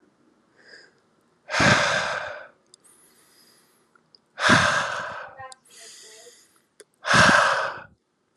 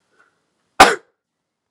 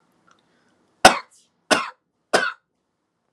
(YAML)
exhalation_length: 8.4 s
exhalation_amplitude: 22608
exhalation_signal_mean_std_ratio: 0.41
cough_length: 1.7 s
cough_amplitude: 32768
cough_signal_mean_std_ratio: 0.21
three_cough_length: 3.3 s
three_cough_amplitude: 32768
three_cough_signal_mean_std_ratio: 0.23
survey_phase: alpha (2021-03-01 to 2021-08-12)
age: 18-44
gender: Male
wearing_mask: 'No'
symptom_change_to_sense_of_smell_or_taste: true
symptom_loss_of_taste: true
smoker_status: Never smoked
respiratory_condition_asthma: false
respiratory_condition_other: false
recruitment_source: Test and Trace
submission_delay: 1 day
covid_test_result: Positive
covid_test_method: LFT